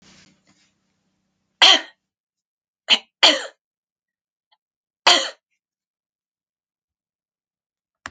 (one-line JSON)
{"cough_length": "8.1 s", "cough_amplitude": 32767, "cough_signal_mean_std_ratio": 0.21, "survey_phase": "alpha (2021-03-01 to 2021-08-12)", "age": "65+", "gender": "Female", "wearing_mask": "No", "symptom_none": true, "smoker_status": "Ex-smoker", "respiratory_condition_asthma": false, "respiratory_condition_other": false, "recruitment_source": "REACT", "submission_delay": "1 day", "covid_test_result": "Negative", "covid_test_method": "RT-qPCR"}